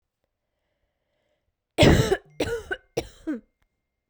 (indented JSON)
{
  "three_cough_length": "4.1 s",
  "three_cough_amplitude": 24495,
  "three_cough_signal_mean_std_ratio": 0.3,
  "survey_phase": "beta (2021-08-13 to 2022-03-07)",
  "age": "18-44",
  "gender": "Female",
  "wearing_mask": "No",
  "symptom_cough_any": true,
  "symptom_diarrhoea": true,
  "symptom_fatigue": true,
  "symptom_headache": true,
  "symptom_change_to_sense_of_smell_or_taste": true,
  "symptom_loss_of_taste": true,
  "symptom_other": true,
  "symptom_onset": "5 days",
  "smoker_status": "Never smoked",
  "respiratory_condition_asthma": false,
  "respiratory_condition_other": false,
  "recruitment_source": "Test and Trace",
  "submission_delay": "1 day",
  "covid_test_result": "Positive",
  "covid_test_method": "RT-qPCR",
  "covid_ct_value": 19.6,
  "covid_ct_gene": "ORF1ab gene",
  "covid_ct_mean": 21.0,
  "covid_viral_load": "130000 copies/ml",
  "covid_viral_load_category": "Low viral load (10K-1M copies/ml)"
}